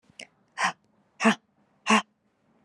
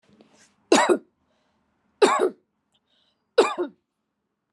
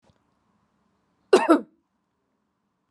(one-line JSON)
{"exhalation_length": "2.6 s", "exhalation_amplitude": 14950, "exhalation_signal_mean_std_ratio": 0.3, "three_cough_length": "4.5 s", "three_cough_amplitude": 21943, "three_cough_signal_mean_std_ratio": 0.31, "cough_length": "2.9 s", "cough_amplitude": 21156, "cough_signal_mean_std_ratio": 0.21, "survey_phase": "alpha (2021-03-01 to 2021-08-12)", "age": "18-44", "gender": "Female", "wearing_mask": "No", "symptom_none": true, "symptom_onset": "9 days", "smoker_status": "Ex-smoker", "respiratory_condition_asthma": false, "respiratory_condition_other": false, "recruitment_source": "REACT", "submission_delay": "2 days", "covid_test_result": "Negative", "covid_test_method": "RT-qPCR"}